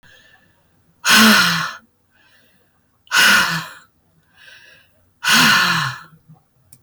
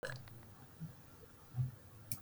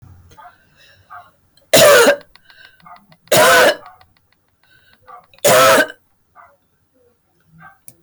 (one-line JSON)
{"exhalation_length": "6.8 s", "exhalation_amplitude": 31245, "exhalation_signal_mean_std_ratio": 0.45, "cough_length": "2.2 s", "cough_amplitude": 4240, "cough_signal_mean_std_ratio": 0.58, "three_cough_length": "8.0 s", "three_cough_amplitude": 32490, "three_cough_signal_mean_std_ratio": 0.39, "survey_phase": "beta (2021-08-13 to 2022-03-07)", "age": "65+", "gender": "Female", "wearing_mask": "No", "symptom_none": true, "smoker_status": "Ex-smoker", "respiratory_condition_asthma": false, "respiratory_condition_other": false, "recruitment_source": "REACT", "submission_delay": "1 day", "covid_test_result": "Positive", "covid_test_method": "RT-qPCR", "covid_ct_value": 28.0, "covid_ct_gene": "N gene", "influenza_a_test_result": "Negative", "influenza_b_test_result": "Negative"}